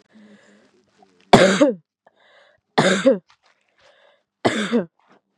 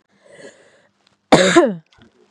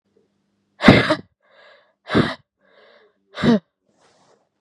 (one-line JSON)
{"three_cough_length": "5.4 s", "three_cough_amplitude": 32768, "three_cough_signal_mean_std_ratio": 0.34, "cough_length": "2.3 s", "cough_amplitude": 32768, "cough_signal_mean_std_ratio": 0.34, "exhalation_length": "4.6 s", "exhalation_amplitude": 32768, "exhalation_signal_mean_std_ratio": 0.29, "survey_phase": "beta (2021-08-13 to 2022-03-07)", "age": "18-44", "gender": "Female", "wearing_mask": "No", "symptom_none": true, "symptom_onset": "12 days", "smoker_status": "Current smoker (1 to 10 cigarettes per day)", "respiratory_condition_asthma": false, "respiratory_condition_other": false, "recruitment_source": "REACT", "submission_delay": "1 day", "covid_test_result": "Negative", "covid_test_method": "RT-qPCR", "influenza_a_test_result": "Negative", "influenza_b_test_result": "Negative"}